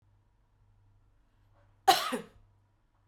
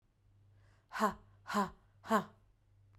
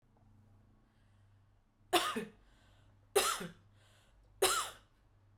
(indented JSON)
{
  "cough_length": "3.1 s",
  "cough_amplitude": 12551,
  "cough_signal_mean_std_ratio": 0.22,
  "exhalation_length": "3.0 s",
  "exhalation_amplitude": 4403,
  "exhalation_signal_mean_std_ratio": 0.35,
  "three_cough_length": "5.4 s",
  "three_cough_amplitude": 5872,
  "three_cough_signal_mean_std_ratio": 0.33,
  "survey_phase": "beta (2021-08-13 to 2022-03-07)",
  "age": "18-44",
  "gender": "Female",
  "wearing_mask": "No",
  "symptom_none": true,
  "smoker_status": "Never smoked",
  "respiratory_condition_asthma": false,
  "respiratory_condition_other": false,
  "recruitment_source": "REACT",
  "submission_delay": "3 days",
  "covid_test_result": "Negative",
  "covid_test_method": "RT-qPCR",
  "influenza_a_test_result": "Negative",
  "influenza_b_test_result": "Negative"
}